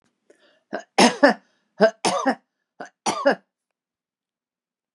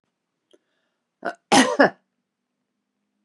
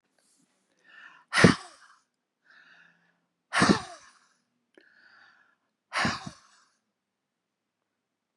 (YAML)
three_cough_length: 4.9 s
three_cough_amplitude: 32026
three_cough_signal_mean_std_ratio: 0.31
cough_length: 3.2 s
cough_amplitude: 30879
cough_signal_mean_std_ratio: 0.25
exhalation_length: 8.4 s
exhalation_amplitude: 26935
exhalation_signal_mean_std_ratio: 0.22
survey_phase: beta (2021-08-13 to 2022-03-07)
age: 65+
gender: Female
wearing_mask: 'No'
symptom_none: true
smoker_status: Ex-smoker
respiratory_condition_asthma: false
respiratory_condition_other: false
recruitment_source: REACT
submission_delay: 2 days
covid_test_result: Negative
covid_test_method: RT-qPCR
influenza_a_test_result: Negative
influenza_b_test_result: Negative